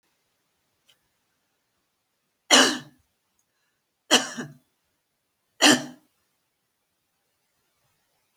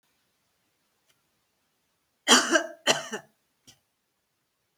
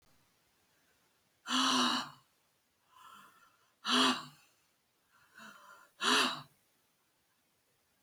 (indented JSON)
{
  "three_cough_length": "8.4 s",
  "three_cough_amplitude": 25703,
  "three_cough_signal_mean_std_ratio": 0.21,
  "cough_length": "4.8 s",
  "cough_amplitude": 21578,
  "cough_signal_mean_std_ratio": 0.24,
  "exhalation_length": "8.0 s",
  "exhalation_amplitude": 6247,
  "exhalation_signal_mean_std_ratio": 0.34,
  "survey_phase": "beta (2021-08-13 to 2022-03-07)",
  "age": "65+",
  "gender": "Female",
  "wearing_mask": "No",
  "symptom_none": true,
  "smoker_status": "Ex-smoker",
  "respiratory_condition_asthma": false,
  "respiratory_condition_other": false,
  "recruitment_source": "REACT",
  "submission_delay": "4 days",
  "covid_test_result": "Negative",
  "covid_test_method": "RT-qPCR"
}